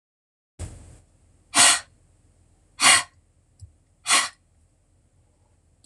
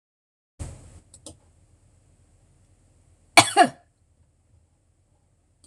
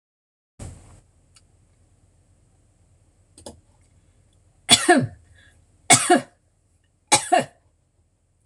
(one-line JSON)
{"exhalation_length": "5.9 s", "exhalation_amplitude": 24973, "exhalation_signal_mean_std_ratio": 0.27, "cough_length": "5.7 s", "cough_amplitude": 26028, "cough_signal_mean_std_ratio": 0.17, "three_cough_length": "8.5 s", "three_cough_amplitude": 26028, "three_cough_signal_mean_std_ratio": 0.25, "survey_phase": "beta (2021-08-13 to 2022-03-07)", "age": "45-64", "gender": "Female", "wearing_mask": "No", "symptom_none": true, "symptom_onset": "11 days", "smoker_status": "Ex-smoker", "respiratory_condition_asthma": false, "respiratory_condition_other": false, "recruitment_source": "REACT", "submission_delay": "5 days", "covid_test_result": "Negative", "covid_test_method": "RT-qPCR"}